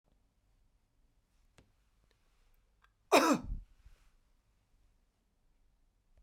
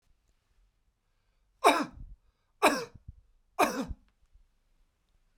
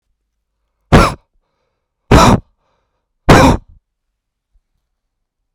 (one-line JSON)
{"cough_length": "6.2 s", "cough_amplitude": 8439, "cough_signal_mean_std_ratio": 0.19, "three_cough_length": "5.4 s", "three_cough_amplitude": 15367, "three_cough_signal_mean_std_ratio": 0.27, "exhalation_length": "5.5 s", "exhalation_amplitude": 32768, "exhalation_signal_mean_std_ratio": 0.31, "survey_phase": "beta (2021-08-13 to 2022-03-07)", "age": "45-64", "gender": "Male", "wearing_mask": "No", "symptom_none": true, "smoker_status": "Never smoked", "respiratory_condition_asthma": true, "respiratory_condition_other": false, "recruitment_source": "Test and Trace", "submission_delay": "2 days", "covid_test_result": "Negative", "covid_test_method": "ePCR"}